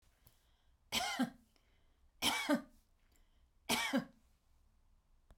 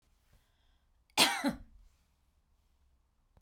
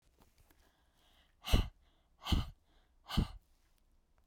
{"three_cough_length": "5.4 s", "three_cough_amplitude": 2849, "three_cough_signal_mean_std_ratio": 0.37, "cough_length": "3.4 s", "cough_amplitude": 9181, "cough_signal_mean_std_ratio": 0.25, "exhalation_length": "4.3 s", "exhalation_amplitude": 6248, "exhalation_signal_mean_std_ratio": 0.27, "survey_phase": "beta (2021-08-13 to 2022-03-07)", "age": "45-64", "gender": "Female", "wearing_mask": "No", "symptom_none": true, "smoker_status": "Ex-smoker", "respiratory_condition_asthma": false, "respiratory_condition_other": false, "recruitment_source": "REACT", "submission_delay": "1 day", "covid_test_result": "Negative", "covid_test_method": "RT-qPCR"}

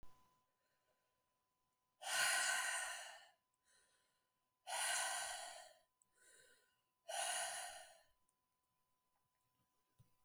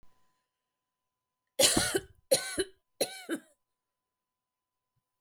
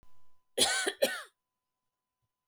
{"exhalation_length": "10.2 s", "exhalation_amplitude": 1639, "exhalation_signal_mean_std_ratio": 0.42, "three_cough_length": "5.2 s", "three_cough_amplitude": 13939, "three_cough_signal_mean_std_ratio": 0.3, "cough_length": "2.5 s", "cough_amplitude": 9899, "cough_signal_mean_std_ratio": 0.39, "survey_phase": "beta (2021-08-13 to 2022-03-07)", "age": "45-64", "gender": "Female", "wearing_mask": "No", "symptom_fatigue": true, "symptom_onset": "3 days", "smoker_status": "Ex-smoker", "respiratory_condition_asthma": false, "respiratory_condition_other": false, "recruitment_source": "REACT", "submission_delay": "1 day", "covid_test_result": "Negative", "covid_test_method": "RT-qPCR", "influenza_a_test_result": "Negative", "influenza_b_test_result": "Negative"}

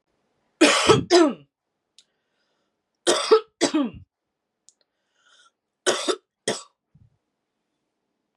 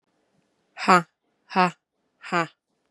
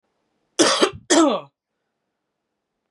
{"three_cough_length": "8.4 s", "three_cough_amplitude": 26149, "three_cough_signal_mean_std_ratio": 0.32, "exhalation_length": "2.9 s", "exhalation_amplitude": 29445, "exhalation_signal_mean_std_ratio": 0.26, "cough_length": "2.9 s", "cough_amplitude": 27695, "cough_signal_mean_std_ratio": 0.36, "survey_phase": "beta (2021-08-13 to 2022-03-07)", "age": "18-44", "gender": "Female", "wearing_mask": "No", "symptom_cough_any": true, "symptom_runny_or_blocked_nose": true, "smoker_status": "Never smoked", "respiratory_condition_asthma": false, "respiratory_condition_other": false, "recruitment_source": "Test and Trace", "submission_delay": "1 day", "covid_test_result": "Positive", "covid_test_method": "LFT"}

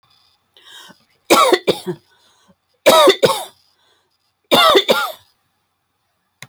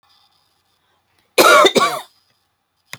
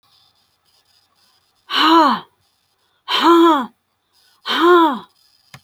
{"three_cough_length": "6.5 s", "three_cough_amplitude": 30296, "three_cough_signal_mean_std_ratio": 0.37, "cough_length": "3.0 s", "cough_amplitude": 30299, "cough_signal_mean_std_ratio": 0.34, "exhalation_length": "5.6 s", "exhalation_amplitude": 27680, "exhalation_signal_mean_std_ratio": 0.45, "survey_phase": "beta (2021-08-13 to 2022-03-07)", "age": "65+", "gender": "Female", "wearing_mask": "No", "symptom_none": true, "smoker_status": "Never smoked", "respiratory_condition_asthma": false, "respiratory_condition_other": false, "recruitment_source": "REACT", "submission_delay": "0 days", "covid_test_result": "Negative", "covid_test_method": "RT-qPCR"}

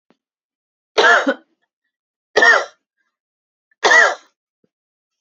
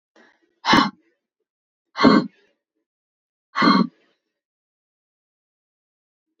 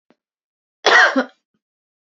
{"three_cough_length": "5.2 s", "three_cough_amplitude": 32768, "three_cough_signal_mean_std_ratio": 0.34, "exhalation_length": "6.4 s", "exhalation_amplitude": 27453, "exhalation_signal_mean_std_ratio": 0.27, "cough_length": "2.1 s", "cough_amplitude": 28478, "cough_signal_mean_std_ratio": 0.32, "survey_phase": "beta (2021-08-13 to 2022-03-07)", "age": "18-44", "gender": "Female", "wearing_mask": "No", "symptom_none": true, "smoker_status": "Never smoked", "respiratory_condition_asthma": false, "respiratory_condition_other": false, "recruitment_source": "REACT", "submission_delay": "2 days", "covid_test_result": "Negative", "covid_test_method": "RT-qPCR", "influenza_a_test_result": "Negative", "influenza_b_test_result": "Negative"}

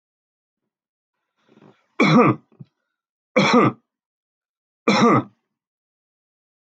{"three_cough_length": "6.7 s", "three_cough_amplitude": 23066, "three_cough_signal_mean_std_ratio": 0.33, "survey_phase": "alpha (2021-03-01 to 2021-08-12)", "age": "65+", "gender": "Male", "wearing_mask": "No", "symptom_none": true, "smoker_status": "Never smoked", "respiratory_condition_asthma": false, "respiratory_condition_other": false, "recruitment_source": "REACT", "submission_delay": "1 day", "covid_test_result": "Negative", "covid_test_method": "RT-qPCR"}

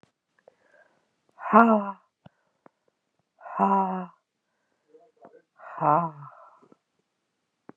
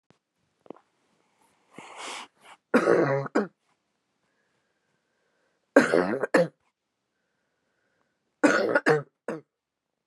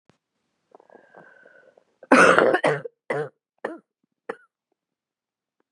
{"exhalation_length": "7.8 s", "exhalation_amplitude": 30330, "exhalation_signal_mean_std_ratio": 0.28, "three_cough_length": "10.1 s", "three_cough_amplitude": 24858, "three_cough_signal_mean_std_ratio": 0.32, "cough_length": "5.7 s", "cough_amplitude": 31847, "cough_signal_mean_std_ratio": 0.28, "survey_phase": "beta (2021-08-13 to 2022-03-07)", "age": "18-44", "gender": "Female", "wearing_mask": "No", "symptom_cough_any": true, "symptom_runny_or_blocked_nose": true, "symptom_sore_throat": true, "symptom_fatigue": true, "symptom_fever_high_temperature": true, "symptom_headache": true, "smoker_status": "Never smoked", "respiratory_condition_asthma": false, "respiratory_condition_other": false, "recruitment_source": "Test and Trace", "submission_delay": "2 days", "covid_test_result": "Positive", "covid_test_method": "RT-qPCR", "covid_ct_value": 22.9, "covid_ct_gene": "N gene"}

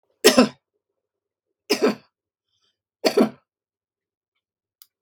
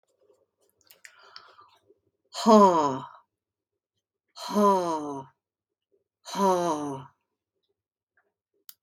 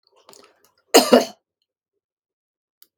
{"three_cough_length": "5.0 s", "three_cough_amplitude": 32767, "three_cough_signal_mean_std_ratio": 0.25, "exhalation_length": "8.8 s", "exhalation_amplitude": 17737, "exhalation_signal_mean_std_ratio": 0.34, "cough_length": "3.0 s", "cough_amplitude": 32768, "cough_signal_mean_std_ratio": 0.22, "survey_phase": "beta (2021-08-13 to 2022-03-07)", "age": "65+", "gender": "Female", "wearing_mask": "No", "symptom_none": true, "smoker_status": "Ex-smoker", "respiratory_condition_asthma": false, "respiratory_condition_other": false, "recruitment_source": "REACT", "submission_delay": "1 day", "covid_test_result": "Negative", "covid_test_method": "RT-qPCR", "influenza_a_test_result": "Negative", "influenza_b_test_result": "Negative"}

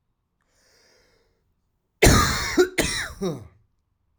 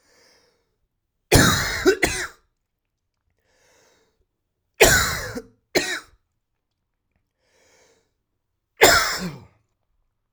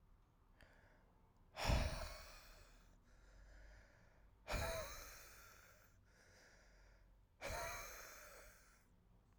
{"cough_length": "4.2 s", "cough_amplitude": 26568, "cough_signal_mean_std_ratio": 0.36, "three_cough_length": "10.3 s", "three_cough_amplitude": 32768, "three_cough_signal_mean_std_ratio": 0.31, "exhalation_length": "9.4 s", "exhalation_amplitude": 1867, "exhalation_signal_mean_std_ratio": 0.43, "survey_phase": "alpha (2021-03-01 to 2021-08-12)", "age": "18-44", "gender": "Male", "wearing_mask": "No", "symptom_cough_any": true, "symptom_onset": "3 days", "smoker_status": "Never smoked", "respiratory_condition_asthma": false, "respiratory_condition_other": false, "recruitment_source": "Test and Trace", "submission_delay": "2 days", "covid_test_result": "Positive", "covid_test_method": "RT-qPCR"}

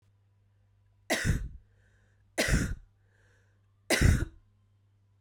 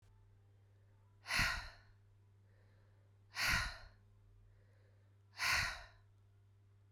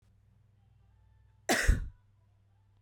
{"three_cough_length": "5.2 s", "three_cough_amplitude": 9211, "three_cough_signal_mean_std_ratio": 0.36, "exhalation_length": "6.9 s", "exhalation_amplitude": 2460, "exhalation_signal_mean_std_ratio": 0.39, "cough_length": "2.8 s", "cough_amplitude": 7727, "cough_signal_mean_std_ratio": 0.28, "survey_phase": "beta (2021-08-13 to 2022-03-07)", "age": "18-44", "gender": "Female", "wearing_mask": "No", "symptom_cough_any": true, "symptom_runny_or_blocked_nose": true, "symptom_sore_throat": true, "symptom_diarrhoea": true, "symptom_fatigue": true, "symptom_headache": true, "symptom_change_to_sense_of_smell_or_taste": true, "symptom_onset": "4 days", "smoker_status": "Never smoked", "respiratory_condition_asthma": false, "respiratory_condition_other": true, "recruitment_source": "Test and Trace", "submission_delay": "2 days", "covid_test_result": "Positive", "covid_test_method": "RT-qPCR"}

